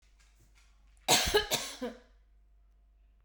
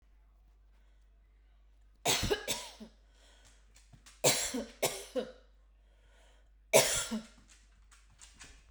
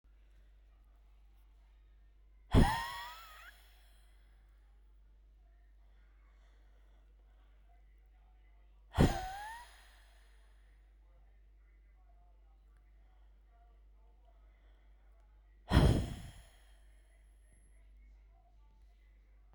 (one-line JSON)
{"cough_length": "3.2 s", "cough_amplitude": 9086, "cough_signal_mean_std_ratio": 0.35, "three_cough_length": "8.7 s", "three_cough_amplitude": 10886, "three_cough_signal_mean_std_ratio": 0.35, "exhalation_length": "19.5 s", "exhalation_amplitude": 7163, "exhalation_signal_mean_std_ratio": 0.25, "survey_phase": "beta (2021-08-13 to 2022-03-07)", "age": "45-64", "gender": "Female", "wearing_mask": "No", "symptom_none": true, "smoker_status": "Never smoked", "respiratory_condition_asthma": true, "respiratory_condition_other": false, "recruitment_source": "REACT", "submission_delay": "1 day", "covid_test_result": "Negative", "covid_test_method": "RT-qPCR"}